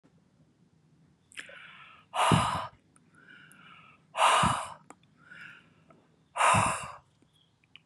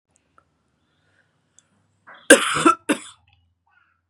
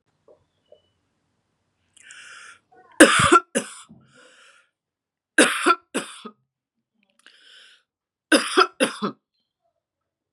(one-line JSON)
{"exhalation_length": "7.9 s", "exhalation_amplitude": 11173, "exhalation_signal_mean_std_ratio": 0.37, "cough_length": "4.1 s", "cough_amplitude": 32768, "cough_signal_mean_std_ratio": 0.23, "three_cough_length": "10.3 s", "three_cough_amplitude": 32768, "three_cough_signal_mean_std_ratio": 0.26, "survey_phase": "beta (2021-08-13 to 2022-03-07)", "age": "65+", "gender": "Female", "wearing_mask": "No", "symptom_none": true, "smoker_status": "Never smoked", "respiratory_condition_asthma": false, "respiratory_condition_other": false, "recruitment_source": "REACT", "submission_delay": "2 days", "covid_test_result": "Negative", "covid_test_method": "RT-qPCR", "covid_ct_value": 40.0, "covid_ct_gene": "N gene", "influenza_a_test_result": "Negative", "influenza_b_test_result": "Negative"}